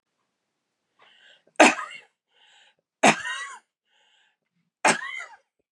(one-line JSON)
{"three_cough_length": "5.7 s", "three_cough_amplitude": 29821, "three_cough_signal_mean_std_ratio": 0.25, "survey_phase": "beta (2021-08-13 to 2022-03-07)", "age": "65+", "gender": "Female", "wearing_mask": "No", "symptom_runny_or_blocked_nose": true, "symptom_sore_throat": true, "symptom_fatigue": true, "symptom_headache": true, "symptom_other": true, "symptom_onset": "3 days", "smoker_status": "Never smoked", "respiratory_condition_asthma": false, "respiratory_condition_other": false, "recruitment_source": "Test and Trace", "submission_delay": "1 day", "covid_test_result": "Positive", "covid_test_method": "RT-qPCR", "covid_ct_value": 17.7, "covid_ct_gene": "ORF1ab gene", "covid_ct_mean": 18.9, "covid_viral_load": "630000 copies/ml", "covid_viral_load_category": "Low viral load (10K-1M copies/ml)"}